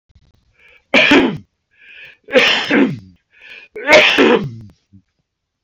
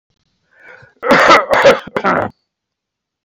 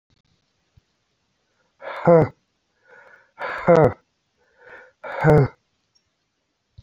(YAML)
three_cough_length: 5.6 s
three_cough_amplitude: 32768
three_cough_signal_mean_std_ratio: 0.46
cough_length: 3.2 s
cough_amplitude: 30618
cough_signal_mean_std_ratio: 0.45
exhalation_length: 6.8 s
exhalation_amplitude: 27956
exhalation_signal_mean_std_ratio: 0.29
survey_phase: alpha (2021-03-01 to 2021-08-12)
age: 65+
gender: Male
wearing_mask: 'No'
symptom_none: true
symptom_onset: 11 days
smoker_status: Ex-smoker
respiratory_condition_asthma: false
respiratory_condition_other: false
recruitment_source: REACT
submission_delay: 1 day
covid_test_result: Negative
covid_test_method: RT-qPCR